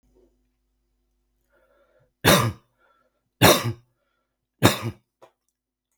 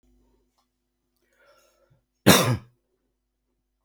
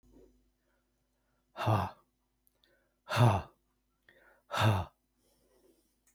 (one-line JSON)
{"three_cough_length": "6.0 s", "three_cough_amplitude": 32749, "three_cough_signal_mean_std_ratio": 0.26, "cough_length": "3.8 s", "cough_amplitude": 32751, "cough_signal_mean_std_ratio": 0.21, "exhalation_length": "6.1 s", "exhalation_amplitude": 8777, "exhalation_signal_mean_std_ratio": 0.3, "survey_phase": "beta (2021-08-13 to 2022-03-07)", "age": "65+", "gender": "Male", "wearing_mask": "No", "symptom_none": true, "smoker_status": "Ex-smoker", "respiratory_condition_asthma": false, "respiratory_condition_other": false, "recruitment_source": "REACT", "submission_delay": "1 day", "covid_test_result": "Negative", "covid_test_method": "RT-qPCR", "influenza_a_test_result": "Negative", "influenza_b_test_result": "Negative"}